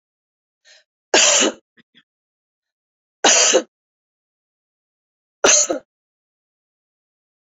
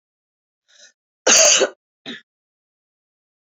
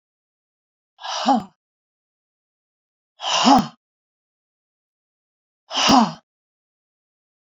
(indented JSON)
{
  "three_cough_length": "7.5 s",
  "three_cough_amplitude": 31501,
  "three_cough_signal_mean_std_ratio": 0.3,
  "cough_length": "3.5 s",
  "cough_amplitude": 29903,
  "cough_signal_mean_std_ratio": 0.29,
  "exhalation_length": "7.4 s",
  "exhalation_amplitude": 28161,
  "exhalation_signal_mean_std_ratio": 0.29,
  "survey_phase": "beta (2021-08-13 to 2022-03-07)",
  "age": "65+",
  "gender": "Female",
  "wearing_mask": "No",
  "symptom_cough_any": true,
  "symptom_new_continuous_cough": true,
  "symptom_sore_throat": true,
  "symptom_fatigue": true,
  "symptom_headache": true,
  "symptom_other": true,
  "symptom_onset": "5 days",
  "smoker_status": "Never smoked",
  "respiratory_condition_asthma": false,
  "respiratory_condition_other": false,
  "recruitment_source": "Test and Trace",
  "submission_delay": "2 days",
  "covid_test_result": "Positive",
  "covid_test_method": "RT-qPCR",
  "covid_ct_value": 20.8,
  "covid_ct_gene": "ORF1ab gene",
  "covid_ct_mean": 21.0,
  "covid_viral_load": "130000 copies/ml",
  "covid_viral_load_category": "Low viral load (10K-1M copies/ml)"
}